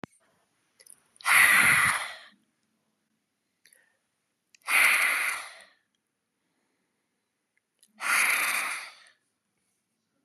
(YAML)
exhalation_length: 10.2 s
exhalation_amplitude: 15703
exhalation_signal_mean_std_ratio: 0.38
survey_phase: beta (2021-08-13 to 2022-03-07)
age: 45-64
gender: Female
wearing_mask: 'No'
symptom_none: true
smoker_status: Never smoked
respiratory_condition_asthma: false
respiratory_condition_other: false
recruitment_source: REACT
submission_delay: 1 day
covid_test_result: Negative
covid_test_method: RT-qPCR
influenza_a_test_result: Unknown/Void
influenza_b_test_result: Unknown/Void